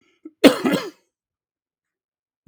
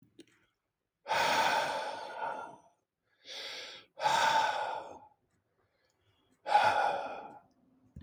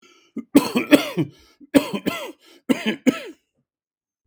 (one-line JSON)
{"cough_length": "2.5 s", "cough_amplitude": 32768, "cough_signal_mean_std_ratio": 0.24, "exhalation_length": "8.0 s", "exhalation_amplitude": 6788, "exhalation_signal_mean_std_ratio": 0.51, "three_cough_length": "4.3 s", "three_cough_amplitude": 32768, "three_cough_signal_mean_std_ratio": 0.35, "survey_phase": "beta (2021-08-13 to 2022-03-07)", "age": "45-64", "gender": "Male", "wearing_mask": "No", "symptom_none": true, "smoker_status": "Ex-smoker", "respiratory_condition_asthma": true, "respiratory_condition_other": false, "recruitment_source": "REACT", "submission_delay": "0 days", "covid_test_result": "Negative", "covid_test_method": "RT-qPCR"}